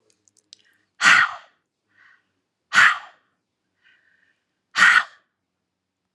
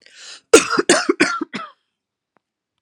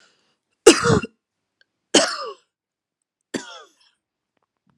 {"exhalation_length": "6.1 s", "exhalation_amplitude": 31402, "exhalation_signal_mean_std_ratio": 0.28, "cough_length": "2.8 s", "cough_amplitude": 32768, "cough_signal_mean_std_ratio": 0.35, "three_cough_length": "4.8 s", "three_cough_amplitude": 32768, "three_cough_signal_mean_std_ratio": 0.24, "survey_phase": "alpha (2021-03-01 to 2021-08-12)", "age": "18-44", "gender": "Female", "wearing_mask": "No", "symptom_none": true, "smoker_status": "Never smoked", "respiratory_condition_asthma": true, "respiratory_condition_other": false, "recruitment_source": "REACT", "submission_delay": "1 day", "covid_test_result": "Negative", "covid_test_method": "RT-qPCR"}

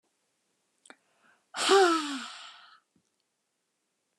{"exhalation_length": "4.2 s", "exhalation_amplitude": 10405, "exhalation_signal_mean_std_ratio": 0.3, "survey_phase": "beta (2021-08-13 to 2022-03-07)", "age": "65+", "gender": "Female", "wearing_mask": "No", "symptom_none": true, "smoker_status": "Never smoked", "respiratory_condition_asthma": false, "respiratory_condition_other": false, "recruitment_source": "REACT", "submission_delay": "3 days", "covid_test_result": "Negative", "covid_test_method": "RT-qPCR"}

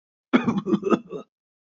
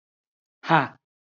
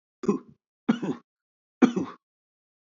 {"cough_length": "1.7 s", "cough_amplitude": 24456, "cough_signal_mean_std_ratio": 0.44, "exhalation_length": "1.3 s", "exhalation_amplitude": 24214, "exhalation_signal_mean_std_ratio": 0.25, "three_cough_length": "3.0 s", "three_cough_amplitude": 21943, "three_cough_signal_mean_std_ratio": 0.28, "survey_phase": "beta (2021-08-13 to 2022-03-07)", "age": "45-64", "gender": "Male", "wearing_mask": "No", "symptom_fatigue": true, "symptom_headache": true, "symptom_onset": "12 days", "smoker_status": "Never smoked", "respiratory_condition_asthma": false, "respiratory_condition_other": false, "recruitment_source": "REACT", "submission_delay": "1 day", "covid_test_result": "Negative", "covid_test_method": "RT-qPCR", "influenza_a_test_result": "Negative", "influenza_b_test_result": "Negative"}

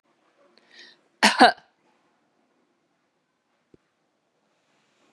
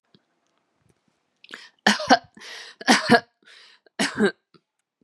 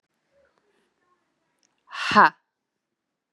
{"cough_length": "5.1 s", "cough_amplitude": 32039, "cough_signal_mean_std_ratio": 0.17, "three_cough_length": "5.0 s", "three_cough_amplitude": 32483, "three_cough_signal_mean_std_ratio": 0.3, "exhalation_length": "3.3 s", "exhalation_amplitude": 26946, "exhalation_signal_mean_std_ratio": 0.2, "survey_phase": "beta (2021-08-13 to 2022-03-07)", "age": "18-44", "gender": "Female", "wearing_mask": "No", "symptom_sore_throat": true, "symptom_onset": "12 days", "smoker_status": "Ex-smoker", "respiratory_condition_asthma": false, "respiratory_condition_other": false, "recruitment_source": "REACT", "submission_delay": "1 day", "covid_test_result": "Negative", "covid_test_method": "RT-qPCR", "influenza_a_test_result": "Negative", "influenza_b_test_result": "Negative"}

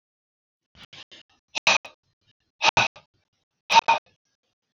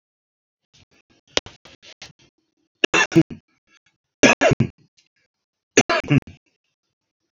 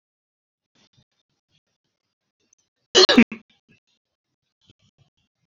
{"exhalation_length": "4.7 s", "exhalation_amplitude": 24018, "exhalation_signal_mean_std_ratio": 0.25, "three_cough_length": "7.3 s", "three_cough_amplitude": 32710, "three_cough_signal_mean_std_ratio": 0.26, "cough_length": "5.5 s", "cough_amplitude": 28182, "cough_signal_mean_std_ratio": 0.17, "survey_phase": "beta (2021-08-13 to 2022-03-07)", "age": "65+", "gender": "Male", "wearing_mask": "No", "symptom_none": true, "smoker_status": "Never smoked", "respiratory_condition_asthma": false, "respiratory_condition_other": false, "recruitment_source": "REACT", "submission_delay": "2 days", "covid_test_result": "Negative", "covid_test_method": "RT-qPCR", "influenza_a_test_result": "Negative", "influenza_b_test_result": "Negative"}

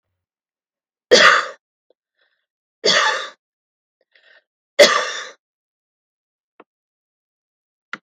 {"three_cough_length": "8.0 s", "three_cough_amplitude": 32768, "three_cough_signal_mean_std_ratio": 0.27, "survey_phase": "beta (2021-08-13 to 2022-03-07)", "age": "65+", "gender": "Female", "wearing_mask": "No", "symptom_none": true, "smoker_status": "Never smoked", "respiratory_condition_asthma": false, "respiratory_condition_other": false, "recruitment_source": "REACT", "submission_delay": "2 days", "covid_test_result": "Negative", "covid_test_method": "RT-qPCR", "influenza_a_test_result": "Negative", "influenza_b_test_result": "Negative"}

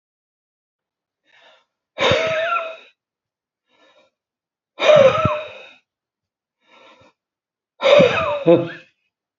{"exhalation_length": "9.4 s", "exhalation_amplitude": 30421, "exhalation_signal_mean_std_ratio": 0.36, "survey_phase": "beta (2021-08-13 to 2022-03-07)", "age": "45-64", "gender": "Male", "wearing_mask": "No", "symptom_cough_any": true, "smoker_status": "Never smoked", "respiratory_condition_asthma": false, "respiratory_condition_other": false, "recruitment_source": "REACT", "submission_delay": "1 day", "covid_test_result": "Negative", "covid_test_method": "RT-qPCR", "influenza_a_test_result": "Negative", "influenza_b_test_result": "Negative"}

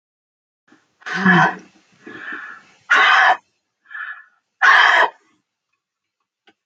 {"exhalation_length": "6.7 s", "exhalation_amplitude": 28494, "exhalation_signal_mean_std_ratio": 0.4, "survey_phase": "alpha (2021-03-01 to 2021-08-12)", "age": "45-64", "gender": "Female", "wearing_mask": "No", "symptom_none": true, "smoker_status": "Never smoked", "respiratory_condition_asthma": false, "respiratory_condition_other": false, "recruitment_source": "REACT", "submission_delay": "3 days", "covid_test_result": "Negative", "covid_test_method": "RT-qPCR", "covid_ct_value": 42.0, "covid_ct_gene": "N gene"}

